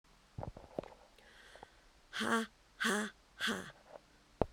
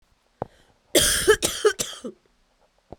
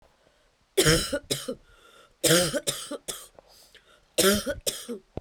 {
  "exhalation_length": "4.5 s",
  "exhalation_amplitude": 7961,
  "exhalation_signal_mean_std_ratio": 0.41,
  "cough_length": "3.0 s",
  "cough_amplitude": 22250,
  "cough_signal_mean_std_ratio": 0.38,
  "three_cough_length": "5.2 s",
  "three_cough_amplitude": 16647,
  "three_cough_signal_mean_std_ratio": 0.44,
  "survey_phase": "beta (2021-08-13 to 2022-03-07)",
  "age": "45-64",
  "gender": "Female",
  "wearing_mask": "No",
  "symptom_cough_any": true,
  "symptom_runny_or_blocked_nose": true,
  "symptom_shortness_of_breath": true,
  "symptom_sore_throat": true,
  "symptom_fatigue": true,
  "symptom_other": true,
  "symptom_onset": "11 days",
  "smoker_status": "Ex-smoker",
  "respiratory_condition_asthma": false,
  "respiratory_condition_other": false,
  "recruitment_source": "REACT",
  "submission_delay": "2 days",
  "covid_test_result": "Negative",
  "covid_test_method": "RT-qPCR",
  "influenza_a_test_result": "Unknown/Void",
  "influenza_b_test_result": "Unknown/Void"
}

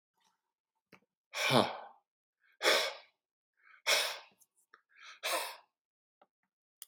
{
  "exhalation_length": "6.9 s",
  "exhalation_amplitude": 8796,
  "exhalation_signal_mean_std_ratio": 0.33,
  "survey_phase": "beta (2021-08-13 to 2022-03-07)",
  "age": "65+",
  "gender": "Male",
  "wearing_mask": "No",
  "symptom_none": true,
  "smoker_status": "Ex-smoker",
  "respiratory_condition_asthma": false,
  "respiratory_condition_other": false,
  "recruitment_source": "REACT",
  "submission_delay": "1 day",
  "covid_test_result": "Negative",
  "covid_test_method": "RT-qPCR",
  "influenza_a_test_result": "Negative",
  "influenza_b_test_result": "Negative"
}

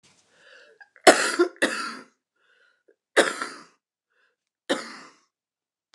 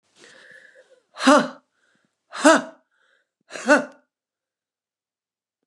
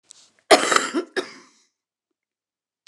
{
  "three_cough_length": "5.9 s",
  "three_cough_amplitude": 29197,
  "three_cough_signal_mean_std_ratio": 0.27,
  "exhalation_length": "5.7 s",
  "exhalation_amplitude": 29200,
  "exhalation_signal_mean_std_ratio": 0.26,
  "cough_length": "2.9 s",
  "cough_amplitude": 29204,
  "cough_signal_mean_std_ratio": 0.28,
  "survey_phase": "beta (2021-08-13 to 2022-03-07)",
  "age": "65+",
  "gender": "Female",
  "wearing_mask": "No",
  "symptom_cough_any": true,
  "smoker_status": "Ex-smoker",
  "respiratory_condition_asthma": true,
  "respiratory_condition_other": false,
  "recruitment_source": "REACT",
  "submission_delay": "4 days",
  "covid_test_result": "Negative",
  "covid_test_method": "RT-qPCR",
  "influenza_a_test_result": "Negative",
  "influenza_b_test_result": "Negative"
}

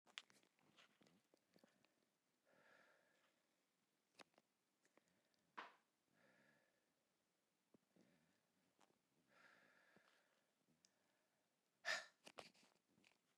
{
  "exhalation_length": "13.4 s",
  "exhalation_amplitude": 890,
  "exhalation_signal_mean_std_ratio": 0.21,
  "survey_phase": "beta (2021-08-13 to 2022-03-07)",
  "age": "45-64",
  "gender": "Female",
  "wearing_mask": "No",
  "symptom_cough_any": true,
  "symptom_new_continuous_cough": true,
  "symptom_runny_or_blocked_nose": true,
  "symptom_fatigue": true,
  "symptom_change_to_sense_of_smell_or_taste": true,
  "symptom_loss_of_taste": true,
  "symptom_onset": "6 days",
  "smoker_status": "Never smoked",
  "respiratory_condition_asthma": false,
  "respiratory_condition_other": false,
  "recruitment_source": "Test and Trace",
  "submission_delay": "1 day",
  "covid_test_result": "Positive",
  "covid_test_method": "RT-qPCR"
}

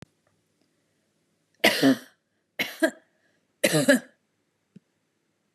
{
  "three_cough_length": "5.5 s",
  "three_cough_amplitude": 21226,
  "three_cough_signal_mean_std_ratio": 0.29,
  "survey_phase": "beta (2021-08-13 to 2022-03-07)",
  "age": "18-44",
  "gender": "Female",
  "wearing_mask": "No",
  "symptom_cough_any": true,
  "symptom_sore_throat": true,
  "symptom_fatigue": true,
  "symptom_other": true,
  "symptom_onset": "3 days",
  "smoker_status": "Never smoked",
  "respiratory_condition_asthma": false,
  "respiratory_condition_other": false,
  "recruitment_source": "REACT",
  "submission_delay": "1 day",
  "covid_test_result": "Negative",
  "covid_test_method": "RT-qPCR",
  "influenza_a_test_result": "Negative",
  "influenza_b_test_result": "Negative"
}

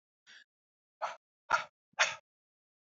{
  "exhalation_length": "2.9 s",
  "exhalation_amplitude": 6884,
  "exhalation_signal_mean_std_ratio": 0.25,
  "survey_phase": "beta (2021-08-13 to 2022-03-07)",
  "age": "18-44",
  "gender": "Male",
  "wearing_mask": "No",
  "symptom_cough_any": true,
  "symptom_runny_or_blocked_nose": true,
  "symptom_shortness_of_breath": true,
  "symptom_sore_throat": true,
  "symptom_fatigue": true,
  "smoker_status": "Ex-smoker",
  "respiratory_condition_asthma": false,
  "respiratory_condition_other": false,
  "recruitment_source": "Test and Trace",
  "submission_delay": "2 days",
  "covid_test_result": "Positive",
  "covid_test_method": "RT-qPCR",
  "covid_ct_value": 23.4,
  "covid_ct_gene": "ORF1ab gene"
}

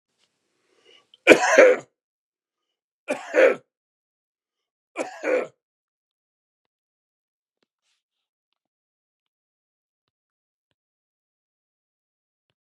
{
  "three_cough_length": "12.6 s",
  "three_cough_amplitude": 32768,
  "three_cough_signal_mean_std_ratio": 0.2,
  "survey_phase": "beta (2021-08-13 to 2022-03-07)",
  "age": "65+",
  "gender": "Male",
  "wearing_mask": "No",
  "symptom_none": true,
  "symptom_onset": "6 days",
  "smoker_status": "Ex-smoker",
  "respiratory_condition_asthma": false,
  "respiratory_condition_other": false,
  "recruitment_source": "REACT",
  "submission_delay": "5 days",
  "covid_test_result": "Negative",
  "covid_test_method": "RT-qPCR",
  "influenza_a_test_result": "Negative",
  "influenza_b_test_result": "Negative"
}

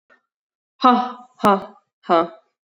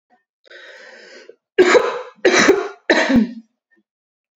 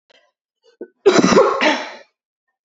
{
  "exhalation_length": "2.6 s",
  "exhalation_amplitude": 30432,
  "exhalation_signal_mean_std_ratio": 0.36,
  "three_cough_length": "4.4 s",
  "three_cough_amplitude": 30655,
  "three_cough_signal_mean_std_ratio": 0.44,
  "cough_length": "2.6 s",
  "cough_amplitude": 29459,
  "cough_signal_mean_std_ratio": 0.43,
  "survey_phase": "beta (2021-08-13 to 2022-03-07)",
  "age": "18-44",
  "gender": "Female",
  "wearing_mask": "No",
  "symptom_runny_or_blocked_nose": true,
  "symptom_fatigue": true,
  "symptom_fever_high_temperature": true,
  "symptom_onset": "2 days",
  "smoker_status": "Never smoked",
  "respiratory_condition_asthma": false,
  "respiratory_condition_other": false,
  "recruitment_source": "Test and Trace",
  "submission_delay": "1 day",
  "covid_test_result": "Positive",
  "covid_test_method": "RT-qPCR",
  "covid_ct_value": 11.8,
  "covid_ct_gene": "ORF1ab gene",
  "covid_ct_mean": 12.1,
  "covid_viral_load": "110000000 copies/ml",
  "covid_viral_load_category": "High viral load (>1M copies/ml)"
}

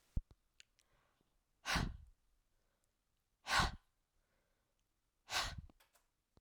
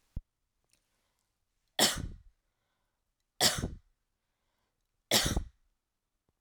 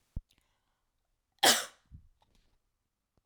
{
  "exhalation_length": "6.4 s",
  "exhalation_amplitude": 3471,
  "exhalation_signal_mean_std_ratio": 0.28,
  "three_cough_length": "6.4 s",
  "three_cough_amplitude": 10799,
  "three_cough_signal_mean_std_ratio": 0.27,
  "cough_length": "3.3 s",
  "cough_amplitude": 12541,
  "cough_signal_mean_std_ratio": 0.2,
  "survey_phase": "beta (2021-08-13 to 2022-03-07)",
  "age": "18-44",
  "gender": "Female",
  "wearing_mask": "No",
  "symptom_none": true,
  "smoker_status": "Never smoked",
  "respiratory_condition_asthma": false,
  "respiratory_condition_other": false,
  "recruitment_source": "REACT",
  "submission_delay": "5 days",
  "covid_test_result": "Negative",
  "covid_test_method": "RT-qPCR"
}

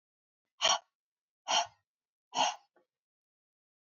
{
  "exhalation_length": "3.8 s",
  "exhalation_amplitude": 6257,
  "exhalation_signal_mean_std_ratio": 0.28,
  "survey_phase": "alpha (2021-03-01 to 2021-08-12)",
  "age": "18-44",
  "gender": "Female",
  "wearing_mask": "No",
  "symptom_fatigue": true,
  "smoker_status": "Never smoked",
  "respiratory_condition_asthma": false,
  "respiratory_condition_other": false,
  "recruitment_source": "REACT",
  "submission_delay": "1 day",
  "covid_test_result": "Negative",
  "covid_test_method": "RT-qPCR"
}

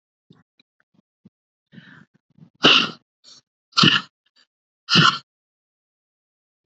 {
  "exhalation_length": "6.7 s",
  "exhalation_amplitude": 28370,
  "exhalation_signal_mean_std_ratio": 0.26,
  "survey_phase": "beta (2021-08-13 to 2022-03-07)",
  "age": "45-64",
  "gender": "Female",
  "wearing_mask": "No",
  "symptom_cough_any": true,
  "symptom_new_continuous_cough": true,
  "symptom_runny_or_blocked_nose": true,
  "symptom_sore_throat": true,
  "symptom_onset": "4 days",
  "smoker_status": "Ex-smoker",
  "respiratory_condition_asthma": false,
  "respiratory_condition_other": false,
  "recruitment_source": "Test and Trace",
  "submission_delay": "2 days",
  "covid_test_result": "Positive",
  "covid_test_method": "RT-qPCR",
  "covid_ct_value": 19.2,
  "covid_ct_gene": "ORF1ab gene"
}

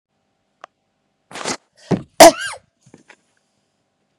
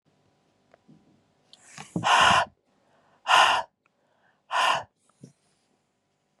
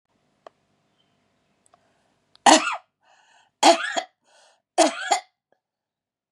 {
  "cough_length": "4.2 s",
  "cough_amplitude": 32768,
  "cough_signal_mean_std_ratio": 0.2,
  "exhalation_length": "6.4 s",
  "exhalation_amplitude": 20128,
  "exhalation_signal_mean_std_ratio": 0.34,
  "three_cough_length": "6.3 s",
  "three_cough_amplitude": 30933,
  "three_cough_signal_mean_std_ratio": 0.26,
  "survey_phase": "beta (2021-08-13 to 2022-03-07)",
  "age": "45-64",
  "gender": "Female",
  "wearing_mask": "No",
  "symptom_cough_any": true,
  "symptom_new_continuous_cough": true,
  "symptom_sore_throat": true,
  "symptom_headache": true,
  "symptom_onset": "2 days",
  "smoker_status": "Ex-smoker",
  "respiratory_condition_asthma": false,
  "respiratory_condition_other": false,
  "recruitment_source": "Test and Trace",
  "submission_delay": "2 days",
  "covid_test_result": "Positive",
  "covid_test_method": "RT-qPCR",
  "covid_ct_value": 36.4,
  "covid_ct_gene": "N gene"
}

